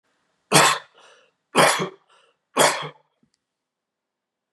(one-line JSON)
{"three_cough_length": "4.5 s", "three_cough_amplitude": 29332, "three_cough_signal_mean_std_ratio": 0.33, "survey_phase": "beta (2021-08-13 to 2022-03-07)", "age": "65+", "gender": "Male", "wearing_mask": "No", "symptom_cough_any": true, "symptom_runny_or_blocked_nose": true, "smoker_status": "Never smoked", "respiratory_condition_asthma": false, "respiratory_condition_other": false, "recruitment_source": "REACT", "submission_delay": "3 days", "covid_test_result": "Negative", "covid_test_method": "RT-qPCR", "influenza_a_test_result": "Negative", "influenza_b_test_result": "Negative"}